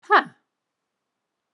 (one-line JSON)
{"exhalation_length": "1.5 s", "exhalation_amplitude": 22052, "exhalation_signal_mean_std_ratio": 0.2, "survey_phase": "alpha (2021-03-01 to 2021-08-12)", "age": "45-64", "gender": "Female", "wearing_mask": "No", "symptom_none": true, "symptom_onset": "13 days", "smoker_status": "Never smoked", "respiratory_condition_asthma": false, "respiratory_condition_other": false, "recruitment_source": "REACT", "submission_delay": "1 day", "covid_test_result": "Negative", "covid_test_method": "RT-qPCR"}